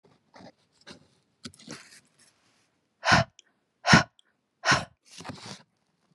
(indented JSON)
{
  "exhalation_length": "6.1 s",
  "exhalation_amplitude": 23545,
  "exhalation_signal_mean_std_ratio": 0.24,
  "survey_phase": "beta (2021-08-13 to 2022-03-07)",
  "age": "45-64",
  "gender": "Female",
  "wearing_mask": "No",
  "symptom_none": true,
  "smoker_status": "Never smoked",
  "respiratory_condition_asthma": false,
  "respiratory_condition_other": false,
  "recruitment_source": "REACT",
  "submission_delay": "1 day",
  "covid_test_result": "Negative",
  "covid_test_method": "RT-qPCR"
}